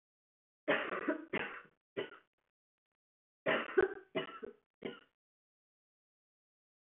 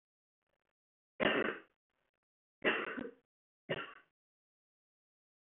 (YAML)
cough_length: 7.0 s
cough_amplitude: 4546
cough_signal_mean_std_ratio: 0.32
three_cough_length: 5.6 s
three_cough_amplitude: 3916
three_cough_signal_mean_std_ratio: 0.29
survey_phase: beta (2021-08-13 to 2022-03-07)
age: 18-44
gender: Female
wearing_mask: 'No'
symptom_cough_any: true
symptom_runny_or_blocked_nose: true
symptom_sore_throat: true
symptom_headache: true
smoker_status: Never smoked
respiratory_condition_asthma: false
respiratory_condition_other: false
recruitment_source: Test and Trace
submission_delay: 1 day
covid_test_result: Positive
covid_test_method: LFT